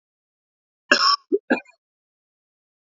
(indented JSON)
{
  "cough_length": "2.9 s",
  "cough_amplitude": 29028,
  "cough_signal_mean_std_ratio": 0.27,
  "survey_phase": "beta (2021-08-13 to 2022-03-07)",
  "age": "18-44",
  "gender": "Male",
  "wearing_mask": "No",
  "symptom_none": true,
  "smoker_status": "Never smoked",
  "respiratory_condition_asthma": false,
  "respiratory_condition_other": false,
  "recruitment_source": "REACT",
  "submission_delay": "1 day",
  "covid_test_result": "Negative",
  "covid_test_method": "RT-qPCR",
  "influenza_a_test_result": "Negative",
  "influenza_b_test_result": "Negative"
}